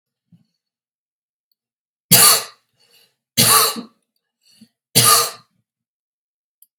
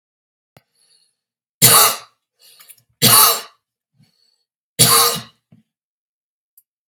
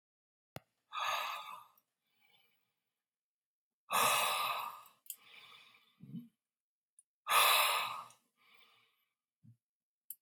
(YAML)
cough_length: 6.8 s
cough_amplitude: 32768
cough_signal_mean_std_ratio: 0.31
three_cough_length: 6.9 s
three_cough_amplitude: 32768
three_cough_signal_mean_std_ratio: 0.32
exhalation_length: 10.2 s
exhalation_amplitude: 6058
exhalation_signal_mean_std_ratio: 0.36
survey_phase: alpha (2021-03-01 to 2021-08-12)
age: 45-64
gender: Male
wearing_mask: 'No'
symptom_none: true
smoker_status: Never smoked
respiratory_condition_asthma: false
respiratory_condition_other: false
recruitment_source: REACT
submission_delay: 3 days
covid_test_result: Negative
covid_test_method: RT-qPCR